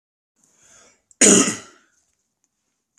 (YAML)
cough_length: 3.0 s
cough_amplitude: 32768
cough_signal_mean_std_ratio: 0.26
survey_phase: alpha (2021-03-01 to 2021-08-12)
age: 18-44
gender: Male
wearing_mask: 'No'
symptom_none: true
smoker_status: Never smoked
respiratory_condition_asthma: false
respiratory_condition_other: false
recruitment_source: REACT
submission_delay: 1 day
covid_test_result: Negative
covid_test_method: RT-qPCR